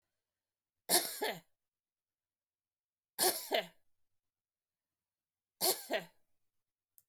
{"three_cough_length": "7.1 s", "three_cough_amplitude": 5901, "three_cough_signal_mean_std_ratio": 0.28, "survey_phase": "beta (2021-08-13 to 2022-03-07)", "age": "65+", "gender": "Female", "wearing_mask": "No", "symptom_none": true, "smoker_status": "Ex-smoker", "respiratory_condition_asthma": true, "respiratory_condition_other": false, "recruitment_source": "REACT", "submission_delay": "2 days", "covid_test_result": "Negative", "covid_test_method": "RT-qPCR", "influenza_a_test_result": "Negative", "influenza_b_test_result": "Negative"}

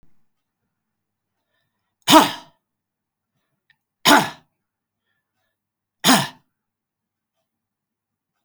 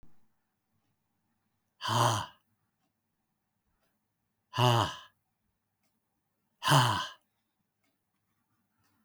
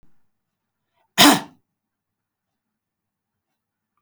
{"three_cough_length": "8.4 s", "three_cough_amplitude": 32768, "three_cough_signal_mean_std_ratio": 0.21, "exhalation_length": "9.0 s", "exhalation_amplitude": 11097, "exhalation_signal_mean_std_ratio": 0.28, "cough_length": "4.0 s", "cough_amplitude": 32766, "cough_signal_mean_std_ratio": 0.18, "survey_phase": "beta (2021-08-13 to 2022-03-07)", "age": "65+", "gender": "Male", "wearing_mask": "No", "symptom_none": true, "smoker_status": "Never smoked", "respiratory_condition_asthma": false, "respiratory_condition_other": false, "recruitment_source": "REACT", "submission_delay": "3 days", "covid_test_result": "Negative", "covid_test_method": "RT-qPCR", "influenza_a_test_result": "Negative", "influenza_b_test_result": "Negative"}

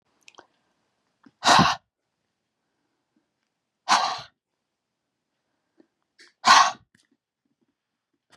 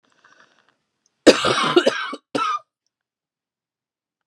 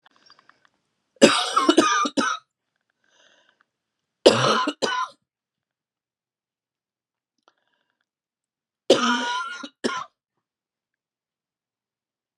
{"exhalation_length": "8.4 s", "exhalation_amplitude": 25774, "exhalation_signal_mean_std_ratio": 0.24, "cough_length": "4.3 s", "cough_amplitude": 32768, "cough_signal_mean_std_ratio": 0.32, "three_cough_length": "12.4 s", "three_cough_amplitude": 32768, "three_cough_signal_mean_std_ratio": 0.31, "survey_phase": "beta (2021-08-13 to 2022-03-07)", "age": "45-64", "gender": "Female", "wearing_mask": "No", "symptom_fatigue": true, "symptom_onset": "8 days", "smoker_status": "Ex-smoker", "respiratory_condition_asthma": true, "respiratory_condition_other": false, "recruitment_source": "REACT", "submission_delay": "1 day", "covid_test_result": "Positive", "covid_test_method": "RT-qPCR", "covid_ct_value": 29.0, "covid_ct_gene": "E gene", "influenza_a_test_result": "Negative", "influenza_b_test_result": "Negative"}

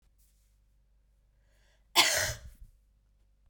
{"cough_length": "3.5 s", "cough_amplitude": 12162, "cough_signal_mean_std_ratio": 0.27, "survey_phase": "beta (2021-08-13 to 2022-03-07)", "age": "18-44", "gender": "Female", "wearing_mask": "No", "symptom_cough_any": true, "symptom_new_continuous_cough": true, "symptom_runny_or_blocked_nose": true, "symptom_shortness_of_breath": true, "symptom_sore_throat": true, "symptom_fatigue": true, "symptom_headache": true, "symptom_other": true, "symptom_onset": "4 days", "smoker_status": "Never smoked", "respiratory_condition_asthma": true, "respiratory_condition_other": false, "recruitment_source": "Test and Trace", "submission_delay": "2 days", "covid_test_result": "Positive", "covid_test_method": "RT-qPCR"}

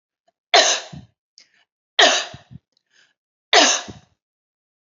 {"three_cough_length": "4.9 s", "three_cough_amplitude": 32716, "three_cough_signal_mean_std_ratio": 0.31, "survey_phase": "beta (2021-08-13 to 2022-03-07)", "age": "45-64", "gender": "Female", "wearing_mask": "No", "symptom_none": true, "symptom_onset": "12 days", "smoker_status": "Never smoked", "respiratory_condition_asthma": false, "respiratory_condition_other": false, "recruitment_source": "REACT", "submission_delay": "2 days", "covid_test_result": "Negative", "covid_test_method": "RT-qPCR", "influenza_a_test_result": "Negative", "influenza_b_test_result": "Negative"}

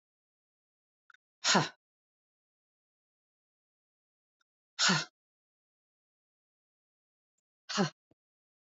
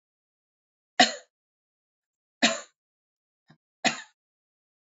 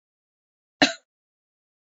{"exhalation_length": "8.6 s", "exhalation_amplitude": 8614, "exhalation_signal_mean_std_ratio": 0.2, "three_cough_length": "4.9 s", "three_cough_amplitude": 21596, "three_cough_signal_mean_std_ratio": 0.19, "cough_length": "1.9 s", "cough_amplitude": 25124, "cough_signal_mean_std_ratio": 0.15, "survey_phase": "beta (2021-08-13 to 2022-03-07)", "age": "45-64", "gender": "Female", "wearing_mask": "No", "symptom_runny_or_blocked_nose": true, "symptom_other": true, "smoker_status": "Never smoked", "respiratory_condition_asthma": false, "respiratory_condition_other": false, "recruitment_source": "Test and Trace", "submission_delay": "2 days", "covid_test_result": "Positive", "covid_test_method": "RT-qPCR"}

